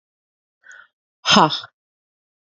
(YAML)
exhalation_length: 2.6 s
exhalation_amplitude: 28744
exhalation_signal_mean_std_ratio: 0.26
survey_phase: beta (2021-08-13 to 2022-03-07)
age: 18-44
gender: Female
wearing_mask: 'No'
symptom_cough_any: true
symptom_runny_or_blocked_nose: true
symptom_sore_throat: true
symptom_diarrhoea: true
symptom_fatigue: true
symptom_fever_high_temperature: true
symptom_headache: true
symptom_onset: 3 days
smoker_status: Ex-smoker
respiratory_condition_asthma: false
respiratory_condition_other: false
recruitment_source: Test and Trace
submission_delay: 2 days
covid_test_result: Positive
covid_test_method: RT-qPCR
covid_ct_value: 33.7
covid_ct_gene: N gene